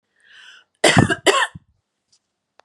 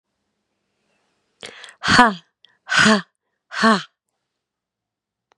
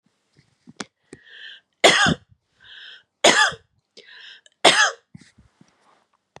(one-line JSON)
{"cough_length": "2.6 s", "cough_amplitude": 32767, "cough_signal_mean_std_ratio": 0.33, "exhalation_length": "5.4 s", "exhalation_amplitude": 32767, "exhalation_signal_mean_std_ratio": 0.3, "three_cough_length": "6.4 s", "three_cough_amplitude": 32331, "three_cough_signal_mean_std_ratio": 0.3, "survey_phase": "beta (2021-08-13 to 2022-03-07)", "age": "18-44", "gender": "Female", "wearing_mask": "No", "symptom_none": true, "smoker_status": "Never smoked", "respiratory_condition_asthma": false, "respiratory_condition_other": false, "recruitment_source": "REACT", "submission_delay": "1 day", "covid_test_result": "Negative", "covid_test_method": "RT-qPCR", "influenza_a_test_result": "Negative", "influenza_b_test_result": "Negative"}